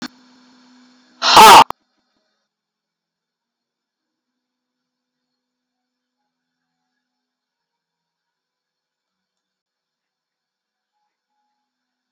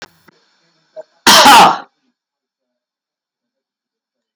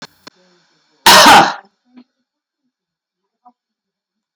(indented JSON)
{
  "exhalation_length": "12.1 s",
  "exhalation_amplitude": 32768,
  "exhalation_signal_mean_std_ratio": 0.16,
  "three_cough_length": "4.4 s",
  "three_cough_amplitude": 32768,
  "three_cough_signal_mean_std_ratio": 0.31,
  "cough_length": "4.4 s",
  "cough_amplitude": 32768,
  "cough_signal_mean_std_ratio": 0.3,
  "survey_phase": "alpha (2021-03-01 to 2021-08-12)",
  "age": "65+",
  "gender": "Male",
  "wearing_mask": "No",
  "symptom_none": true,
  "smoker_status": "Never smoked",
  "respiratory_condition_asthma": false,
  "respiratory_condition_other": false,
  "recruitment_source": "REACT",
  "submission_delay": "1 day",
  "covid_test_result": "Negative",
  "covid_test_method": "RT-qPCR"
}